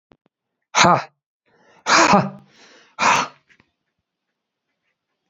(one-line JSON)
{"exhalation_length": "5.3 s", "exhalation_amplitude": 32697, "exhalation_signal_mean_std_ratio": 0.33, "survey_phase": "beta (2021-08-13 to 2022-03-07)", "age": "18-44", "gender": "Male", "wearing_mask": "No", "symptom_cough_any": true, "symptom_sore_throat": true, "symptom_headache": true, "symptom_onset": "5 days", "smoker_status": "Never smoked", "respiratory_condition_asthma": false, "respiratory_condition_other": false, "recruitment_source": "Test and Trace", "submission_delay": "2 days", "covid_test_result": "Positive", "covid_test_method": "RT-qPCR", "covid_ct_value": 20.5, "covid_ct_gene": "N gene"}